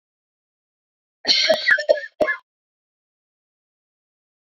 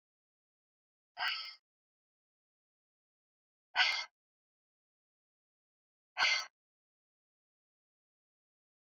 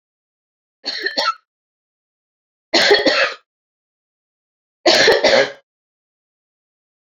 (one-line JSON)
{"cough_length": "4.4 s", "cough_amplitude": 26074, "cough_signal_mean_std_ratio": 0.32, "exhalation_length": "9.0 s", "exhalation_amplitude": 5201, "exhalation_signal_mean_std_ratio": 0.22, "three_cough_length": "7.1 s", "three_cough_amplitude": 29980, "three_cough_signal_mean_std_ratio": 0.37, "survey_phase": "beta (2021-08-13 to 2022-03-07)", "age": "45-64", "gender": "Female", "wearing_mask": "No", "symptom_cough_any": true, "symptom_runny_or_blocked_nose": true, "symptom_fatigue": true, "symptom_headache": true, "symptom_loss_of_taste": true, "symptom_onset": "3 days", "smoker_status": "Never smoked", "respiratory_condition_asthma": false, "respiratory_condition_other": false, "recruitment_source": "Test and Trace", "submission_delay": "2 days", "covid_test_result": "Positive", "covid_test_method": "RT-qPCR", "covid_ct_value": 22.3, "covid_ct_gene": "ORF1ab gene", "covid_ct_mean": 23.0, "covid_viral_load": "30000 copies/ml", "covid_viral_load_category": "Low viral load (10K-1M copies/ml)"}